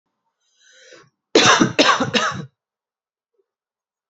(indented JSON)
{
  "cough_length": "4.1 s",
  "cough_amplitude": 31111,
  "cough_signal_mean_std_ratio": 0.36,
  "survey_phase": "beta (2021-08-13 to 2022-03-07)",
  "age": "18-44",
  "gender": "Female",
  "wearing_mask": "No",
  "symptom_runny_or_blocked_nose": true,
  "symptom_fever_high_temperature": true,
  "symptom_headache": true,
  "smoker_status": "Current smoker (1 to 10 cigarettes per day)",
  "respiratory_condition_asthma": false,
  "respiratory_condition_other": false,
  "recruitment_source": "Test and Trace",
  "submission_delay": "2 days",
  "covid_test_result": "Positive",
  "covid_test_method": "ePCR"
}